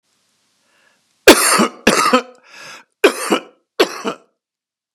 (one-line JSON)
{"three_cough_length": "4.9 s", "three_cough_amplitude": 32768, "three_cough_signal_mean_std_ratio": 0.36, "survey_phase": "beta (2021-08-13 to 2022-03-07)", "age": "65+", "gender": "Male", "wearing_mask": "No", "symptom_cough_any": true, "symptom_shortness_of_breath": true, "symptom_fatigue": true, "symptom_headache": true, "symptom_onset": "8 days", "smoker_status": "Never smoked", "respiratory_condition_asthma": false, "respiratory_condition_other": false, "recruitment_source": "REACT", "submission_delay": "1 day", "covid_test_result": "Negative", "covid_test_method": "RT-qPCR"}